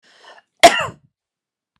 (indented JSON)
{
  "cough_length": "1.8 s",
  "cough_amplitude": 32768,
  "cough_signal_mean_std_ratio": 0.23,
  "survey_phase": "beta (2021-08-13 to 2022-03-07)",
  "age": "45-64",
  "gender": "Female",
  "wearing_mask": "No",
  "symptom_none": true,
  "symptom_onset": "8 days",
  "smoker_status": "Ex-smoker",
  "respiratory_condition_asthma": false,
  "respiratory_condition_other": false,
  "recruitment_source": "REACT",
  "submission_delay": "1 day",
  "covid_test_result": "Negative",
  "covid_test_method": "RT-qPCR"
}